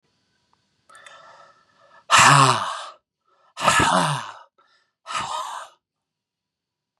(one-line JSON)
{"exhalation_length": "7.0 s", "exhalation_amplitude": 31763, "exhalation_signal_mean_std_ratio": 0.36, "survey_phase": "beta (2021-08-13 to 2022-03-07)", "age": "18-44", "gender": "Male", "wearing_mask": "No", "symptom_none": true, "smoker_status": "Never smoked", "respiratory_condition_asthma": false, "respiratory_condition_other": false, "recruitment_source": "REACT", "submission_delay": "1 day", "covid_test_result": "Negative", "covid_test_method": "RT-qPCR", "influenza_a_test_result": "Negative", "influenza_b_test_result": "Negative"}